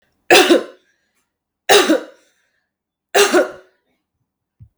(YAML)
three_cough_length: 4.8 s
three_cough_amplitude: 32768
three_cough_signal_mean_std_ratio: 0.36
survey_phase: beta (2021-08-13 to 2022-03-07)
age: 18-44
gender: Female
wearing_mask: 'No'
symptom_cough_any: true
symptom_runny_or_blocked_nose: true
symptom_fatigue: true
symptom_change_to_sense_of_smell_or_taste: true
symptom_loss_of_taste: true
symptom_onset: 3 days
smoker_status: Never smoked
respiratory_condition_asthma: false
respiratory_condition_other: false
recruitment_source: Test and Trace
submission_delay: 2 days
covid_test_result: Positive
covid_test_method: RT-qPCR
covid_ct_value: 20.9
covid_ct_gene: S gene
covid_ct_mean: 21.6
covid_viral_load: 81000 copies/ml
covid_viral_load_category: Low viral load (10K-1M copies/ml)